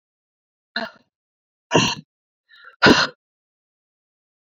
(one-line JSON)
{"exhalation_length": "4.5 s", "exhalation_amplitude": 29376, "exhalation_signal_mean_std_ratio": 0.25, "survey_phase": "beta (2021-08-13 to 2022-03-07)", "age": "18-44", "gender": "Female", "wearing_mask": "No", "symptom_cough_any": true, "symptom_new_continuous_cough": true, "symptom_runny_or_blocked_nose": true, "symptom_shortness_of_breath": true, "symptom_fatigue": true, "symptom_fever_high_temperature": true, "symptom_headache": true, "symptom_change_to_sense_of_smell_or_taste": true, "symptom_loss_of_taste": true, "symptom_onset": "4 days", "smoker_status": "Never smoked", "respiratory_condition_asthma": false, "respiratory_condition_other": false, "recruitment_source": "Test and Trace", "submission_delay": "1 day", "covid_test_result": "Positive", "covid_test_method": "RT-qPCR"}